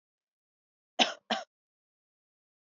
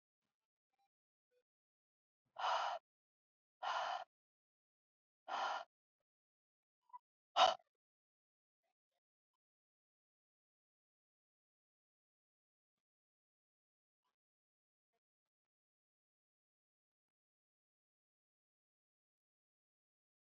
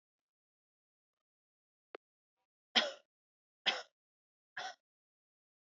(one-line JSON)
{"cough_length": "2.7 s", "cough_amplitude": 12641, "cough_signal_mean_std_ratio": 0.19, "exhalation_length": "20.3 s", "exhalation_amplitude": 3958, "exhalation_signal_mean_std_ratio": 0.17, "three_cough_length": "5.7 s", "three_cough_amplitude": 7467, "three_cough_signal_mean_std_ratio": 0.18, "survey_phase": "beta (2021-08-13 to 2022-03-07)", "age": "18-44", "gender": "Female", "wearing_mask": "No", "symptom_none": true, "smoker_status": "Ex-smoker", "respiratory_condition_asthma": false, "respiratory_condition_other": false, "recruitment_source": "REACT", "submission_delay": "3 days", "covid_test_result": "Negative", "covid_test_method": "RT-qPCR"}